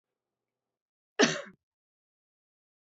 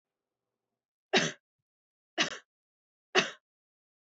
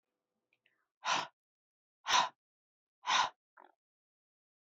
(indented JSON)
{
  "cough_length": "2.9 s",
  "cough_amplitude": 12675,
  "cough_signal_mean_std_ratio": 0.18,
  "three_cough_length": "4.2 s",
  "three_cough_amplitude": 12647,
  "three_cough_signal_mean_std_ratio": 0.23,
  "exhalation_length": "4.7 s",
  "exhalation_amplitude": 5686,
  "exhalation_signal_mean_std_ratio": 0.28,
  "survey_phase": "beta (2021-08-13 to 2022-03-07)",
  "age": "45-64",
  "gender": "Female",
  "wearing_mask": "No",
  "symptom_sore_throat": true,
  "symptom_fatigue": true,
  "symptom_onset": "9 days",
  "smoker_status": "Never smoked",
  "respiratory_condition_asthma": true,
  "respiratory_condition_other": false,
  "recruitment_source": "REACT",
  "submission_delay": "1 day",
  "covid_test_result": "Negative",
  "covid_test_method": "RT-qPCR",
  "influenza_a_test_result": "Negative",
  "influenza_b_test_result": "Negative"
}